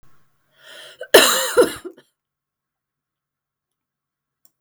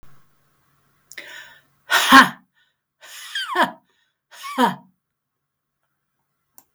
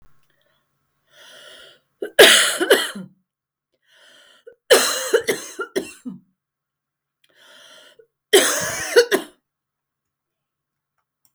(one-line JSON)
{"cough_length": "4.6 s", "cough_amplitude": 32768, "cough_signal_mean_std_ratio": 0.25, "exhalation_length": "6.7 s", "exhalation_amplitude": 32768, "exhalation_signal_mean_std_ratio": 0.26, "three_cough_length": "11.3 s", "three_cough_amplitude": 32768, "three_cough_signal_mean_std_ratio": 0.31, "survey_phase": "beta (2021-08-13 to 2022-03-07)", "age": "45-64", "gender": "Female", "wearing_mask": "No", "symptom_cough_any": true, "symptom_runny_or_blocked_nose": true, "symptom_sore_throat": true, "symptom_fatigue": true, "symptom_fever_high_temperature": true, "symptom_headache": true, "symptom_change_to_sense_of_smell_or_taste": true, "symptom_onset": "4 days", "smoker_status": "Ex-smoker", "respiratory_condition_asthma": false, "respiratory_condition_other": false, "recruitment_source": "Test and Trace", "submission_delay": "1 day", "covid_test_result": "Positive", "covid_test_method": "RT-qPCR", "covid_ct_value": 23.0, "covid_ct_gene": "ORF1ab gene"}